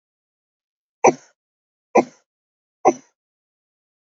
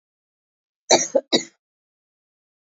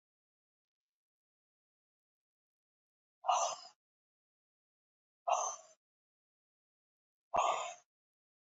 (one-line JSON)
{"three_cough_length": "4.2 s", "three_cough_amplitude": 27709, "three_cough_signal_mean_std_ratio": 0.18, "cough_length": "2.6 s", "cough_amplitude": 29238, "cough_signal_mean_std_ratio": 0.24, "exhalation_length": "8.4 s", "exhalation_amplitude": 3752, "exhalation_signal_mean_std_ratio": 0.25, "survey_phase": "beta (2021-08-13 to 2022-03-07)", "age": "45-64", "gender": "Female", "wearing_mask": "No", "symptom_cough_any": true, "symptom_runny_or_blocked_nose": true, "symptom_abdominal_pain": true, "symptom_fatigue": true, "symptom_fever_high_temperature": true, "symptom_headache": true, "symptom_onset": "5 days", "smoker_status": "Never smoked", "respiratory_condition_asthma": false, "respiratory_condition_other": false, "recruitment_source": "Test and Trace", "submission_delay": "2 days", "covid_test_result": "Positive", "covid_test_method": "RT-qPCR", "covid_ct_value": 16.3, "covid_ct_gene": "ORF1ab gene", "covid_ct_mean": 16.8, "covid_viral_load": "3000000 copies/ml", "covid_viral_load_category": "High viral load (>1M copies/ml)"}